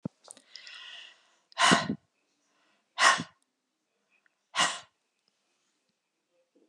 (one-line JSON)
{"exhalation_length": "6.7 s", "exhalation_amplitude": 15853, "exhalation_signal_mean_std_ratio": 0.27, "survey_phase": "beta (2021-08-13 to 2022-03-07)", "age": "65+", "gender": "Female", "wearing_mask": "No", "symptom_none": true, "smoker_status": "Never smoked", "respiratory_condition_asthma": false, "respiratory_condition_other": false, "recruitment_source": "REACT", "submission_delay": "1 day", "covid_test_result": "Negative", "covid_test_method": "RT-qPCR"}